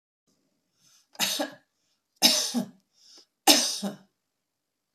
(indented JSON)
{
  "three_cough_length": "4.9 s",
  "three_cough_amplitude": 25195,
  "three_cough_signal_mean_std_ratio": 0.33,
  "survey_phase": "beta (2021-08-13 to 2022-03-07)",
  "age": "65+",
  "gender": "Female",
  "wearing_mask": "No",
  "symptom_none": true,
  "smoker_status": "Ex-smoker",
  "respiratory_condition_asthma": false,
  "respiratory_condition_other": false,
  "recruitment_source": "REACT",
  "submission_delay": "1 day",
  "covid_test_result": "Negative",
  "covid_test_method": "RT-qPCR"
}